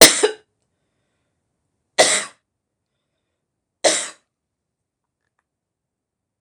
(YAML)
three_cough_length: 6.4 s
three_cough_amplitude: 26028
three_cough_signal_mean_std_ratio: 0.22
survey_phase: beta (2021-08-13 to 2022-03-07)
age: 65+
gender: Female
wearing_mask: 'No'
symptom_none: true
smoker_status: Never smoked
respiratory_condition_asthma: true
respiratory_condition_other: false
recruitment_source: REACT
submission_delay: 2 days
covid_test_result: Negative
covid_test_method: RT-qPCR
influenza_a_test_result: Negative
influenza_b_test_result: Negative